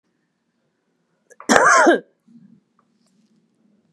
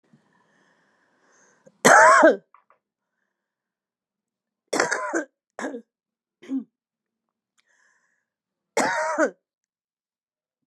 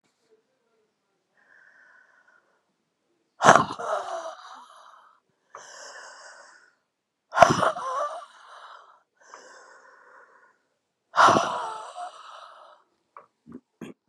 {"cough_length": "3.9 s", "cough_amplitude": 32768, "cough_signal_mean_std_ratio": 0.3, "three_cough_length": "10.7 s", "three_cough_amplitude": 29696, "three_cough_signal_mean_std_ratio": 0.27, "exhalation_length": "14.1 s", "exhalation_amplitude": 32768, "exhalation_signal_mean_std_ratio": 0.26, "survey_phase": "beta (2021-08-13 to 2022-03-07)", "age": "65+", "gender": "Female", "wearing_mask": "No", "symptom_cough_any": true, "symptom_runny_or_blocked_nose": true, "symptom_abdominal_pain": true, "symptom_fatigue": true, "symptom_fever_high_temperature": true, "symptom_headache": true, "symptom_change_to_sense_of_smell_or_taste": true, "symptom_onset": "3 days", "smoker_status": "Ex-smoker", "respiratory_condition_asthma": false, "respiratory_condition_other": false, "recruitment_source": "Test and Trace", "submission_delay": "1 day", "covid_test_result": "Positive", "covid_test_method": "ePCR"}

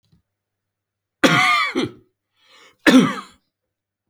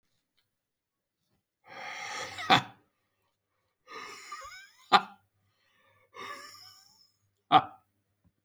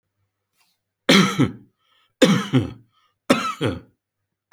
{"cough_length": "4.1 s", "cough_amplitude": 31781, "cough_signal_mean_std_ratio": 0.36, "exhalation_length": "8.4 s", "exhalation_amplitude": 17917, "exhalation_signal_mean_std_ratio": 0.22, "three_cough_length": "4.5 s", "three_cough_amplitude": 32767, "three_cough_signal_mean_std_ratio": 0.37, "survey_phase": "alpha (2021-03-01 to 2021-08-12)", "age": "45-64", "gender": "Male", "wearing_mask": "No", "symptom_none": true, "smoker_status": "Ex-smoker", "respiratory_condition_asthma": false, "respiratory_condition_other": false, "recruitment_source": "REACT", "submission_delay": "1 day", "covid_test_result": "Negative", "covid_test_method": "RT-qPCR"}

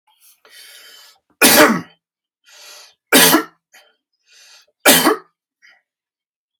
{"three_cough_length": "6.6 s", "three_cough_amplitude": 32768, "three_cough_signal_mean_std_ratio": 0.32, "survey_phase": "alpha (2021-03-01 to 2021-08-12)", "age": "45-64", "gender": "Male", "wearing_mask": "No", "symptom_none": true, "smoker_status": "Never smoked", "respiratory_condition_asthma": false, "respiratory_condition_other": false, "recruitment_source": "REACT", "submission_delay": "3 days", "covid_test_result": "Negative", "covid_test_method": "RT-qPCR"}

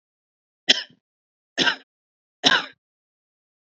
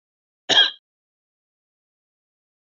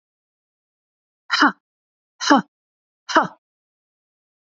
{"three_cough_length": "3.8 s", "three_cough_amplitude": 31115, "three_cough_signal_mean_std_ratio": 0.25, "cough_length": "2.6 s", "cough_amplitude": 22819, "cough_signal_mean_std_ratio": 0.21, "exhalation_length": "4.4 s", "exhalation_amplitude": 27593, "exhalation_signal_mean_std_ratio": 0.25, "survey_phase": "alpha (2021-03-01 to 2021-08-12)", "age": "45-64", "gender": "Female", "wearing_mask": "No", "symptom_none": true, "smoker_status": "Never smoked", "respiratory_condition_asthma": true, "respiratory_condition_other": false, "recruitment_source": "REACT", "submission_delay": "2 days", "covid_test_result": "Negative", "covid_test_method": "RT-qPCR"}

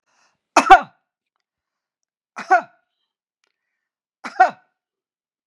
{"three_cough_length": "5.5 s", "three_cough_amplitude": 32768, "three_cough_signal_mean_std_ratio": 0.2, "survey_phase": "beta (2021-08-13 to 2022-03-07)", "age": "65+", "gender": "Female", "wearing_mask": "No", "symptom_none": true, "smoker_status": "Ex-smoker", "respiratory_condition_asthma": false, "respiratory_condition_other": false, "recruitment_source": "REACT", "submission_delay": "1 day", "covid_test_result": "Negative", "covid_test_method": "RT-qPCR", "influenza_a_test_result": "Negative", "influenza_b_test_result": "Negative"}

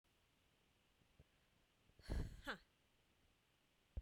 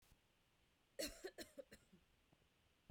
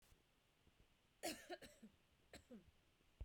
{"exhalation_length": "4.0 s", "exhalation_amplitude": 653, "exhalation_signal_mean_std_ratio": 0.3, "three_cough_length": "2.9 s", "three_cough_amplitude": 725, "three_cough_signal_mean_std_ratio": 0.35, "cough_length": "3.2 s", "cough_amplitude": 535, "cough_signal_mean_std_ratio": 0.4, "survey_phase": "beta (2021-08-13 to 2022-03-07)", "age": "18-44", "gender": "Female", "wearing_mask": "No", "symptom_runny_or_blocked_nose": true, "symptom_sore_throat": true, "symptom_abdominal_pain": true, "symptom_fatigue": true, "symptom_headache": true, "smoker_status": "Never smoked", "respiratory_condition_asthma": false, "respiratory_condition_other": false, "recruitment_source": "Test and Trace", "submission_delay": "1 day", "covid_test_result": "Positive", "covid_test_method": "RT-qPCR", "covid_ct_value": 18.6, "covid_ct_gene": "ORF1ab gene", "covid_ct_mean": 18.7, "covid_viral_load": "720000 copies/ml", "covid_viral_load_category": "Low viral load (10K-1M copies/ml)"}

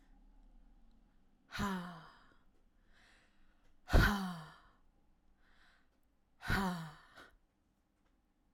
{"exhalation_length": "8.5 s", "exhalation_amplitude": 5710, "exhalation_signal_mean_std_ratio": 0.29, "survey_phase": "alpha (2021-03-01 to 2021-08-12)", "age": "18-44", "gender": "Female", "wearing_mask": "No", "symptom_none": true, "smoker_status": "Never smoked", "respiratory_condition_asthma": false, "respiratory_condition_other": false, "recruitment_source": "REACT", "submission_delay": "2 days", "covid_test_result": "Negative", "covid_test_method": "RT-qPCR"}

